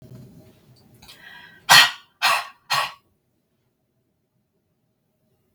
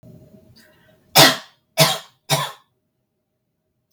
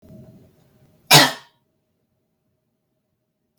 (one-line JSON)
{"exhalation_length": "5.5 s", "exhalation_amplitude": 32768, "exhalation_signal_mean_std_ratio": 0.24, "three_cough_length": "3.9 s", "three_cough_amplitude": 32768, "three_cough_signal_mean_std_ratio": 0.28, "cough_length": "3.6 s", "cough_amplitude": 32768, "cough_signal_mean_std_ratio": 0.19, "survey_phase": "beta (2021-08-13 to 2022-03-07)", "age": "18-44", "gender": "Female", "wearing_mask": "No", "symptom_none": true, "smoker_status": "Never smoked", "respiratory_condition_asthma": false, "respiratory_condition_other": false, "recruitment_source": "REACT", "submission_delay": "1 day", "covid_test_result": "Negative", "covid_test_method": "RT-qPCR"}